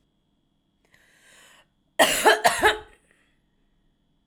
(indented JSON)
{
  "cough_length": "4.3 s",
  "cough_amplitude": 23299,
  "cough_signal_mean_std_ratio": 0.3,
  "survey_phase": "alpha (2021-03-01 to 2021-08-12)",
  "age": "18-44",
  "gender": "Female",
  "wearing_mask": "No",
  "symptom_none": true,
  "smoker_status": "Ex-smoker",
  "respiratory_condition_asthma": false,
  "respiratory_condition_other": false,
  "recruitment_source": "Test and Trace",
  "submission_delay": "0 days",
  "covid_test_result": "Negative",
  "covid_test_method": "LFT"
}